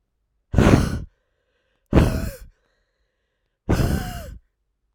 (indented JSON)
{
  "exhalation_length": "4.9 s",
  "exhalation_amplitude": 32767,
  "exhalation_signal_mean_std_ratio": 0.38,
  "survey_phase": "alpha (2021-03-01 to 2021-08-12)",
  "age": "18-44",
  "gender": "Female",
  "wearing_mask": "No",
  "symptom_cough_any": true,
  "symptom_new_continuous_cough": true,
  "symptom_shortness_of_breath": true,
  "symptom_fatigue": true,
  "symptom_fever_high_temperature": true,
  "symptom_headache": true,
  "symptom_change_to_sense_of_smell_or_taste": true,
  "symptom_loss_of_taste": true,
  "symptom_onset": "4 days",
  "smoker_status": "Ex-smoker",
  "respiratory_condition_asthma": false,
  "respiratory_condition_other": false,
  "recruitment_source": "Test and Trace",
  "submission_delay": "2 days",
  "covid_test_result": "Positive",
  "covid_test_method": "RT-qPCR",
  "covid_ct_value": 15.4,
  "covid_ct_gene": "ORF1ab gene",
  "covid_ct_mean": 15.7,
  "covid_viral_load": "6900000 copies/ml",
  "covid_viral_load_category": "High viral load (>1M copies/ml)"
}